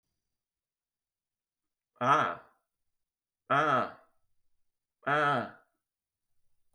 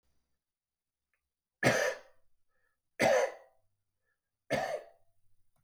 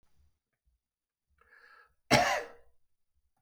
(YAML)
exhalation_length: 6.7 s
exhalation_amplitude: 7939
exhalation_signal_mean_std_ratio: 0.33
three_cough_length: 5.6 s
three_cough_amplitude: 8165
three_cough_signal_mean_std_ratio: 0.32
cough_length: 3.4 s
cough_amplitude: 11101
cough_signal_mean_std_ratio: 0.25
survey_phase: beta (2021-08-13 to 2022-03-07)
age: 65+
gender: Male
wearing_mask: 'No'
symptom_none: true
smoker_status: Prefer not to say
respiratory_condition_asthma: false
respiratory_condition_other: false
recruitment_source: REACT
submission_delay: 2 days
covid_test_result: Negative
covid_test_method: RT-qPCR
influenza_a_test_result: Negative
influenza_b_test_result: Negative